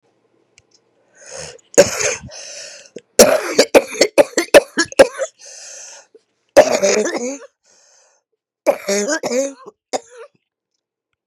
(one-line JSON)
{"cough_length": "11.3 s", "cough_amplitude": 32768, "cough_signal_mean_std_ratio": 0.35, "survey_phase": "beta (2021-08-13 to 2022-03-07)", "age": "65+", "gender": "Female", "wearing_mask": "No", "symptom_cough_any": true, "symptom_runny_or_blocked_nose": true, "symptom_shortness_of_breath": true, "symptom_fatigue": true, "symptom_headache": true, "symptom_other": true, "symptom_onset": "3 days", "smoker_status": "Ex-smoker", "respiratory_condition_asthma": false, "respiratory_condition_other": false, "recruitment_source": "Test and Trace", "submission_delay": "1 day", "covid_test_result": "Positive", "covid_test_method": "ePCR"}